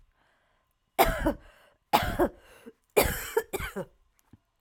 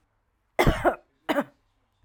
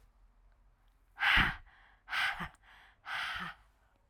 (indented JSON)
{
  "three_cough_length": "4.6 s",
  "three_cough_amplitude": 18381,
  "three_cough_signal_mean_std_ratio": 0.38,
  "cough_length": "2.0 s",
  "cough_amplitude": 18127,
  "cough_signal_mean_std_ratio": 0.35,
  "exhalation_length": "4.1 s",
  "exhalation_amplitude": 6947,
  "exhalation_signal_mean_std_ratio": 0.4,
  "survey_phase": "alpha (2021-03-01 to 2021-08-12)",
  "age": "45-64",
  "gender": "Female",
  "wearing_mask": "No",
  "symptom_fatigue": true,
  "symptom_fever_high_temperature": true,
  "symptom_headache": true,
  "symptom_change_to_sense_of_smell_or_taste": true,
  "symptom_loss_of_taste": true,
  "symptom_onset": "1 day",
  "smoker_status": "Never smoked",
  "respiratory_condition_asthma": false,
  "respiratory_condition_other": false,
  "recruitment_source": "Test and Trace",
  "submission_delay": "1 day",
  "covid_test_result": "Positive",
  "covid_test_method": "RT-qPCR",
  "covid_ct_value": 23.5,
  "covid_ct_gene": "ORF1ab gene"
}